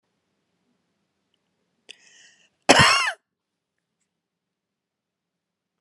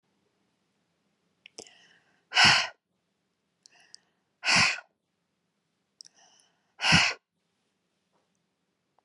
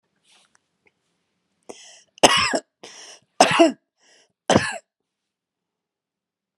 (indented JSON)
{
  "cough_length": "5.8 s",
  "cough_amplitude": 32768,
  "cough_signal_mean_std_ratio": 0.2,
  "exhalation_length": "9.0 s",
  "exhalation_amplitude": 18233,
  "exhalation_signal_mean_std_ratio": 0.25,
  "three_cough_length": "6.6 s",
  "three_cough_amplitude": 32767,
  "three_cough_signal_mean_std_ratio": 0.26,
  "survey_phase": "beta (2021-08-13 to 2022-03-07)",
  "age": "45-64",
  "gender": "Female",
  "wearing_mask": "No",
  "symptom_fatigue": true,
  "smoker_status": "Ex-smoker",
  "respiratory_condition_asthma": false,
  "respiratory_condition_other": false,
  "recruitment_source": "REACT",
  "submission_delay": "3 days",
  "covid_test_result": "Negative",
  "covid_test_method": "RT-qPCR"
}